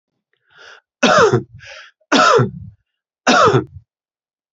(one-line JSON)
{"three_cough_length": "4.5 s", "three_cough_amplitude": 31979, "three_cough_signal_mean_std_ratio": 0.44, "survey_phase": "beta (2021-08-13 to 2022-03-07)", "age": "45-64", "gender": "Male", "wearing_mask": "No", "symptom_sore_throat": true, "symptom_headache": true, "symptom_onset": "5 days", "smoker_status": "Ex-smoker", "respiratory_condition_asthma": false, "respiratory_condition_other": false, "recruitment_source": "REACT", "submission_delay": "1 day", "covid_test_result": "Negative", "covid_test_method": "RT-qPCR"}